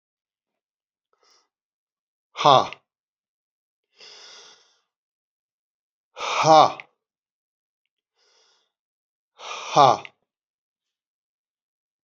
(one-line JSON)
{"exhalation_length": "12.0 s", "exhalation_amplitude": 31106, "exhalation_signal_mean_std_ratio": 0.2, "survey_phase": "beta (2021-08-13 to 2022-03-07)", "age": "65+", "gender": "Male", "wearing_mask": "No", "symptom_none": true, "smoker_status": "Never smoked", "respiratory_condition_asthma": false, "respiratory_condition_other": false, "recruitment_source": "REACT", "submission_delay": "2 days", "covid_test_result": "Negative", "covid_test_method": "RT-qPCR"}